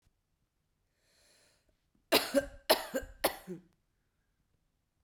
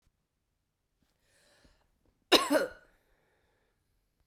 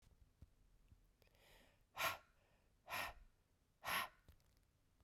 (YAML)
three_cough_length: 5.0 s
three_cough_amplitude: 9910
three_cough_signal_mean_std_ratio: 0.25
cough_length: 4.3 s
cough_amplitude: 14681
cough_signal_mean_std_ratio: 0.2
exhalation_length: 5.0 s
exhalation_amplitude: 1208
exhalation_signal_mean_std_ratio: 0.35
survey_phase: beta (2021-08-13 to 2022-03-07)
age: 18-44
gender: Female
wearing_mask: 'No'
symptom_cough_any: true
symptom_new_continuous_cough: true
symptom_shortness_of_breath: true
symptom_sore_throat: true
symptom_fatigue: true
symptom_fever_high_temperature: true
symptom_headache: true
symptom_change_to_sense_of_smell_or_taste: true
symptom_onset: 3 days
smoker_status: Never smoked
respiratory_condition_asthma: true
respiratory_condition_other: false
recruitment_source: Test and Trace
submission_delay: 2 days
covid_test_result: Positive
covid_test_method: RT-qPCR
covid_ct_value: 21.2
covid_ct_gene: S gene
covid_ct_mean: 21.7
covid_viral_load: 78000 copies/ml
covid_viral_load_category: Low viral load (10K-1M copies/ml)